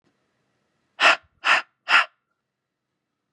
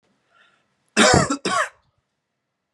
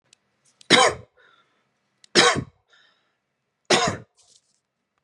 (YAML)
exhalation_length: 3.3 s
exhalation_amplitude: 23735
exhalation_signal_mean_std_ratio: 0.29
cough_length: 2.7 s
cough_amplitude: 27390
cough_signal_mean_std_ratio: 0.36
three_cough_length: 5.0 s
three_cough_amplitude: 29837
three_cough_signal_mean_std_ratio: 0.29
survey_phase: beta (2021-08-13 to 2022-03-07)
age: 18-44
gender: Male
wearing_mask: 'No'
symptom_runny_or_blocked_nose: true
symptom_sore_throat: true
smoker_status: Never smoked
respiratory_condition_asthma: false
respiratory_condition_other: false
recruitment_source: Test and Trace
submission_delay: 1 day
covid_test_result: Positive
covid_test_method: ePCR